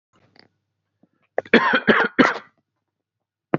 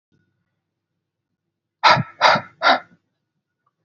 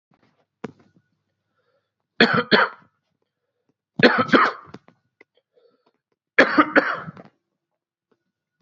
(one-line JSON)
{"cough_length": "3.6 s", "cough_amplitude": 32768, "cough_signal_mean_std_ratio": 0.33, "exhalation_length": "3.8 s", "exhalation_amplitude": 32274, "exhalation_signal_mean_std_ratio": 0.29, "three_cough_length": "8.6 s", "three_cough_amplitude": 28746, "three_cough_signal_mean_std_ratio": 0.29, "survey_phase": "beta (2021-08-13 to 2022-03-07)", "age": "18-44", "gender": "Male", "wearing_mask": "No", "symptom_none": true, "smoker_status": "Ex-smoker", "respiratory_condition_asthma": false, "respiratory_condition_other": false, "recruitment_source": "REACT", "submission_delay": "2 days", "covid_test_result": "Negative", "covid_test_method": "RT-qPCR", "influenza_a_test_result": "Unknown/Void", "influenza_b_test_result": "Unknown/Void"}